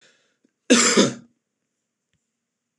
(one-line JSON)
{"cough_length": "2.8 s", "cough_amplitude": 24809, "cough_signal_mean_std_ratio": 0.31, "survey_phase": "beta (2021-08-13 to 2022-03-07)", "age": "45-64", "gender": "Male", "wearing_mask": "No", "symptom_cough_any": true, "symptom_runny_or_blocked_nose": true, "symptom_sore_throat": true, "smoker_status": "Never smoked", "respiratory_condition_asthma": false, "respiratory_condition_other": false, "recruitment_source": "REACT", "submission_delay": "3 days", "covid_test_result": "Negative", "covid_test_method": "RT-qPCR", "influenza_a_test_result": "Negative", "influenza_b_test_result": "Negative"}